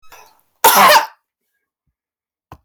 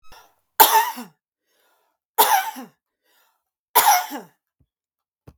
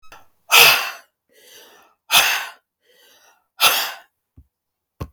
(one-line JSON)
{"cough_length": "2.6 s", "cough_amplitude": 32768, "cough_signal_mean_std_ratio": 0.34, "three_cough_length": "5.4 s", "three_cough_amplitude": 32768, "three_cough_signal_mean_std_ratio": 0.33, "exhalation_length": "5.1 s", "exhalation_amplitude": 32768, "exhalation_signal_mean_std_ratio": 0.34, "survey_phase": "beta (2021-08-13 to 2022-03-07)", "age": "45-64", "gender": "Female", "wearing_mask": "No", "symptom_none": true, "smoker_status": "Never smoked", "respiratory_condition_asthma": true, "respiratory_condition_other": false, "recruitment_source": "REACT", "submission_delay": "4 days", "covid_test_result": "Negative", "covid_test_method": "RT-qPCR"}